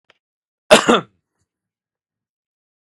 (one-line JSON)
{"cough_length": "2.9 s", "cough_amplitude": 32768, "cough_signal_mean_std_ratio": 0.21, "survey_phase": "beta (2021-08-13 to 2022-03-07)", "age": "45-64", "gender": "Male", "wearing_mask": "No", "symptom_none": true, "smoker_status": "Ex-smoker", "respiratory_condition_asthma": false, "respiratory_condition_other": false, "recruitment_source": "REACT", "submission_delay": "1 day", "covid_test_result": "Negative", "covid_test_method": "RT-qPCR", "influenza_a_test_result": "Negative", "influenza_b_test_result": "Negative"}